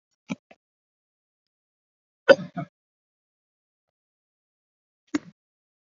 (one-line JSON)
{"cough_length": "6.0 s", "cough_amplitude": 29362, "cough_signal_mean_std_ratio": 0.11, "survey_phase": "beta (2021-08-13 to 2022-03-07)", "age": "65+", "gender": "Male", "wearing_mask": "No", "symptom_none": true, "smoker_status": "Ex-smoker", "respiratory_condition_asthma": false, "respiratory_condition_other": false, "recruitment_source": "REACT", "submission_delay": "2 days", "covid_test_result": "Negative", "covid_test_method": "RT-qPCR"}